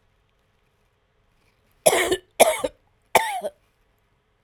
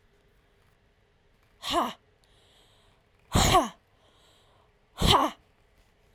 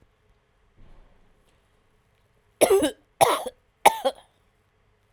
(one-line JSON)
{"cough_length": "4.4 s", "cough_amplitude": 32768, "cough_signal_mean_std_ratio": 0.3, "exhalation_length": "6.1 s", "exhalation_amplitude": 17287, "exhalation_signal_mean_std_ratio": 0.31, "three_cough_length": "5.1 s", "three_cough_amplitude": 30695, "three_cough_signal_mean_std_ratio": 0.27, "survey_phase": "alpha (2021-03-01 to 2021-08-12)", "age": "45-64", "gender": "Female", "wearing_mask": "No", "symptom_none": true, "smoker_status": "Never smoked", "respiratory_condition_asthma": false, "respiratory_condition_other": false, "recruitment_source": "Test and Trace", "submission_delay": "0 days", "covid_test_result": "Negative", "covid_test_method": "LFT"}